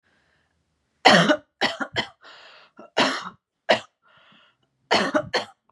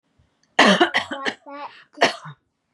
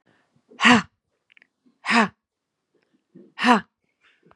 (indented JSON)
{
  "three_cough_length": "5.7 s",
  "three_cough_amplitude": 32285,
  "three_cough_signal_mean_std_ratio": 0.35,
  "cough_length": "2.7 s",
  "cough_amplitude": 31959,
  "cough_signal_mean_std_ratio": 0.39,
  "exhalation_length": "4.4 s",
  "exhalation_amplitude": 28522,
  "exhalation_signal_mean_std_ratio": 0.29,
  "survey_phase": "beta (2021-08-13 to 2022-03-07)",
  "age": "18-44",
  "gender": "Female",
  "wearing_mask": "No",
  "symptom_none": true,
  "smoker_status": "Never smoked",
  "respiratory_condition_asthma": false,
  "respiratory_condition_other": false,
  "recruitment_source": "Test and Trace",
  "submission_delay": "0 days",
  "covid_test_result": "Negative",
  "covid_test_method": "LFT"
}